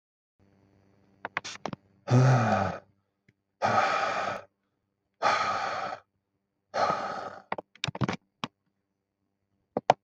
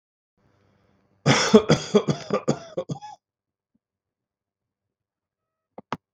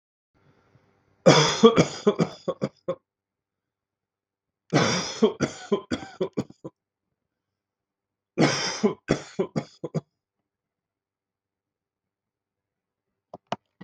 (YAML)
exhalation_length: 10.0 s
exhalation_amplitude: 22614
exhalation_signal_mean_std_ratio: 0.42
cough_length: 6.1 s
cough_amplitude: 32767
cough_signal_mean_std_ratio: 0.28
three_cough_length: 13.8 s
three_cough_amplitude: 32765
three_cough_signal_mean_std_ratio: 0.3
survey_phase: beta (2021-08-13 to 2022-03-07)
age: 45-64
gender: Male
wearing_mask: 'No'
symptom_none: true
smoker_status: Ex-smoker
respiratory_condition_asthma: false
respiratory_condition_other: false
recruitment_source: REACT
submission_delay: 3 days
covid_test_result: Negative
covid_test_method: RT-qPCR
influenza_a_test_result: Unknown/Void
influenza_b_test_result: Unknown/Void